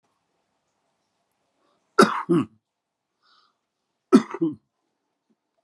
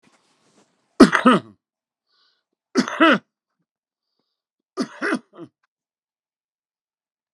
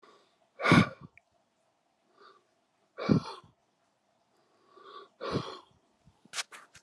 {"cough_length": "5.6 s", "cough_amplitude": 28524, "cough_signal_mean_std_ratio": 0.22, "three_cough_length": "7.3 s", "three_cough_amplitude": 32767, "three_cough_signal_mean_std_ratio": 0.24, "exhalation_length": "6.8 s", "exhalation_amplitude": 13501, "exhalation_signal_mean_std_ratio": 0.25, "survey_phase": "alpha (2021-03-01 to 2021-08-12)", "age": "65+", "gender": "Male", "wearing_mask": "No", "symptom_none": true, "smoker_status": "Ex-smoker", "respiratory_condition_asthma": false, "respiratory_condition_other": true, "recruitment_source": "REACT", "submission_delay": "4 days", "covid_test_result": "Negative", "covid_test_method": "RT-qPCR"}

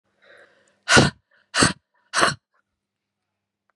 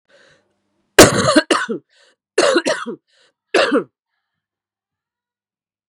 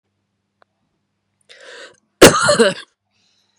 {"exhalation_length": "3.8 s", "exhalation_amplitude": 31289, "exhalation_signal_mean_std_ratio": 0.29, "three_cough_length": "5.9 s", "three_cough_amplitude": 32768, "three_cough_signal_mean_std_ratio": 0.34, "cough_length": "3.6 s", "cough_amplitude": 32768, "cough_signal_mean_std_ratio": 0.28, "survey_phase": "beta (2021-08-13 to 2022-03-07)", "age": "45-64", "gender": "Female", "wearing_mask": "No", "symptom_cough_any": true, "symptom_runny_or_blocked_nose": true, "symptom_shortness_of_breath": true, "symptom_change_to_sense_of_smell_or_taste": true, "smoker_status": "Never smoked", "respiratory_condition_asthma": false, "respiratory_condition_other": false, "recruitment_source": "REACT", "submission_delay": "13 days", "covid_test_result": "Negative", "covid_test_method": "RT-qPCR"}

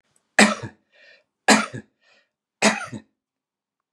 {"three_cough_length": "3.9 s", "three_cough_amplitude": 32767, "three_cough_signal_mean_std_ratio": 0.28, "survey_phase": "beta (2021-08-13 to 2022-03-07)", "age": "65+", "gender": "Male", "wearing_mask": "No", "symptom_none": true, "smoker_status": "Never smoked", "respiratory_condition_asthma": false, "respiratory_condition_other": false, "recruitment_source": "REACT", "submission_delay": "4 days", "covid_test_result": "Negative", "covid_test_method": "RT-qPCR", "influenza_a_test_result": "Negative", "influenza_b_test_result": "Negative"}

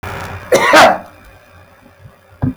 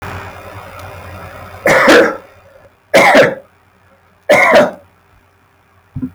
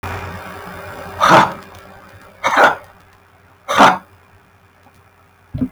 {"cough_length": "2.6 s", "cough_amplitude": 32768, "cough_signal_mean_std_ratio": 0.45, "three_cough_length": "6.1 s", "three_cough_amplitude": 32768, "three_cough_signal_mean_std_ratio": 0.47, "exhalation_length": "5.7 s", "exhalation_amplitude": 32768, "exhalation_signal_mean_std_ratio": 0.39, "survey_phase": "beta (2021-08-13 to 2022-03-07)", "age": "45-64", "gender": "Male", "wearing_mask": "No", "symptom_runny_or_blocked_nose": true, "symptom_onset": "13 days", "smoker_status": "Ex-smoker", "respiratory_condition_asthma": false, "respiratory_condition_other": false, "recruitment_source": "REACT", "submission_delay": "1 day", "covid_test_result": "Negative", "covid_test_method": "RT-qPCR"}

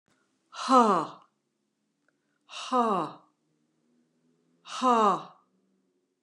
{"exhalation_length": "6.2 s", "exhalation_amplitude": 14906, "exhalation_signal_mean_std_ratio": 0.34, "survey_phase": "beta (2021-08-13 to 2022-03-07)", "age": "65+", "gender": "Female", "wearing_mask": "No", "symptom_abdominal_pain": true, "symptom_other": true, "smoker_status": "Never smoked", "respiratory_condition_asthma": false, "respiratory_condition_other": false, "recruitment_source": "Test and Trace", "submission_delay": "1 day", "covid_test_result": "Negative", "covid_test_method": "RT-qPCR"}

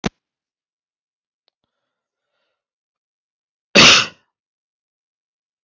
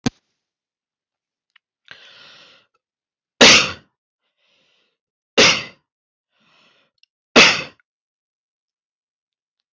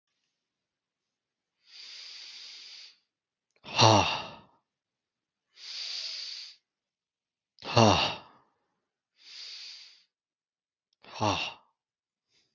{"cough_length": "5.6 s", "cough_amplitude": 32101, "cough_signal_mean_std_ratio": 0.19, "three_cough_length": "9.7 s", "three_cough_amplitude": 32570, "three_cough_signal_mean_std_ratio": 0.22, "exhalation_length": "12.5 s", "exhalation_amplitude": 16411, "exhalation_signal_mean_std_ratio": 0.28, "survey_phase": "beta (2021-08-13 to 2022-03-07)", "age": "18-44", "gender": "Male", "wearing_mask": "No", "symptom_none": true, "smoker_status": "Never smoked", "respiratory_condition_asthma": false, "respiratory_condition_other": false, "recruitment_source": "REACT", "submission_delay": "0 days", "covid_test_result": "Negative", "covid_test_method": "RT-qPCR"}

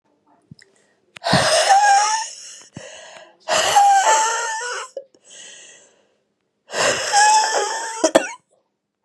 {"exhalation_length": "9.0 s", "exhalation_amplitude": 32768, "exhalation_signal_mean_std_ratio": 0.56, "survey_phase": "beta (2021-08-13 to 2022-03-07)", "age": "18-44", "gender": "Female", "wearing_mask": "No", "symptom_new_continuous_cough": true, "symptom_runny_or_blocked_nose": true, "symptom_sore_throat": true, "symptom_fatigue": true, "symptom_headache": true, "smoker_status": "Never smoked", "respiratory_condition_asthma": false, "respiratory_condition_other": false, "recruitment_source": "Test and Trace", "submission_delay": "1 day", "covid_test_result": "Positive", "covid_test_method": "LFT"}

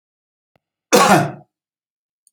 {"cough_length": "2.3 s", "cough_amplitude": 29064, "cough_signal_mean_std_ratio": 0.32, "survey_phase": "beta (2021-08-13 to 2022-03-07)", "age": "65+", "gender": "Male", "wearing_mask": "No", "symptom_sore_throat": true, "symptom_onset": "13 days", "smoker_status": "Never smoked", "respiratory_condition_asthma": false, "respiratory_condition_other": false, "recruitment_source": "REACT", "submission_delay": "0 days", "covid_test_result": "Negative", "covid_test_method": "RT-qPCR"}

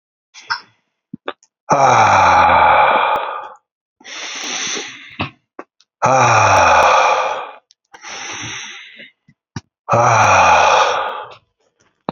{"exhalation_length": "12.1 s", "exhalation_amplitude": 30659, "exhalation_signal_mean_std_ratio": 0.58, "survey_phase": "beta (2021-08-13 to 2022-03-07)", "age": "18-44", "gender": "Male", "wearing_mask": "No", "symptom_sore_throat": true, "symptom_headache": true, "symptom_onset": "4 days", "smoker_status": "Current smoker (e-cigarettes or vapes only)", "respiratory_condition_asthma": false, "respiratory_condition_other": false, "recruitment_source": "Test and Trace", "submission_delay": "2 days", "covid_test_result": "Positive", "covid_test_method": "RT-qPCR", "covid_ct_value": 28.3, "covid_ct_gene": "ORF1ab gene", "covid_ct_mean": 28.6, "covid_viral_load": "430 copies/ml", "covid_viral_load_category": "Minimal viral load (< 10K copies/ml)"}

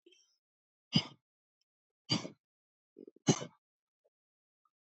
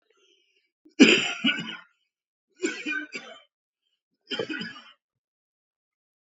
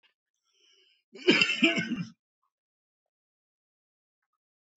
{"exhalation_length": "4.9 s", "exhalation_amplitude": 6989, "exhalation_signal_mean_std_ratio": 0.19, "three_cough_length": "6.4 s", "three_cough_amplitude": 25600, "three_cough_signal_mean_std_ratio": 0.28, "cough_length": "4.8 s", "cough_amplitude": 15920, "cough_signal_mean_std_ratio": 0.28, "survey_phase": "beta (2021-08-13 to 2022-03-07)", "age": "45-64", "gender": "Male", "wearing_mask": "No", "symptom_cough_any": true, "symptom_diarrhoea": true, "symptom_headache": true, "smoker_status": "Current smoker (1 to 10 cigarettes per day)", "respiratory_condition_asthma": false, "respiratory_condition_other": false, "recruitment_source": "Test and Trace", "submission_delay": "2 days", "covid_test_result": "Positive", "covid_test_method": "ePCR"}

